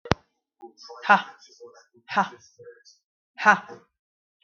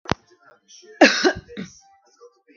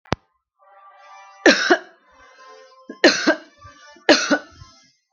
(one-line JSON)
{"exhalation_length": "4.4 s", "exhalation_amplitude": 32768, "exhalation_signal_mean_std_ratio": 0.25, "cough_length": "2.6 s", "cough_amplitude": 32768, "cough_signal_mean_std_ratio": 0.28, "three_cough_length": "5.1 s", "three_cough_amplitude": 32768, "three_cough_signal_mean_std_ratio": 0.32, "survey_phase": "beta (2021-08-13 to 2022-03-07)", "age": "45-64", "gender": "Female", "wearing_mask": "No", "symptom_none": true, "smoker_status": "Never smoked", "respiratory_condition_asthma": false, "respiratory_condition_other": false, "recruitment_source": "REACT", "submission_delay": "1 day", "covid_test_result": "Negative", "covid_test_method": "RT-qPCR"}